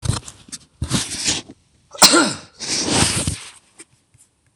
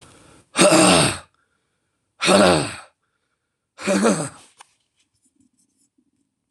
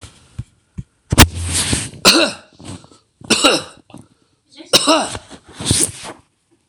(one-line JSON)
{"cough_length": "4.6 s", "cough_amplitude": 26028, "cough_signal_mean_std_ratio": 0.46, "exhalation_length": "6.5 s", "exhalation_amplitude": 26027, "exhalation_signal_mean_std_ratio": 0.38, "three_cough_length": "6.7 s", "three_cough_amplitude": 26028, "three_cough_signal_mean_std_ratio": 0.41, "survey_phase": "beta (2021-08-13 to 2022-03-07)", "age": "65+", "gender": "Male", "wearing_mask": "No", "symptom_cough_any": true, "symptom_runny_or_blocked_nose": true, "smoker_status": "Never smoked", "respiratory_condition_asthma": true, "respiratory_condition_other": false, "recruitment_source": "REACT", "submission_delay": "1 day", "covid_test_result": "Negative", "covid_test_method": "RT-qPCR", "influenza_a_test_result": "Negative", "influenza_b_test_result": "Negative"}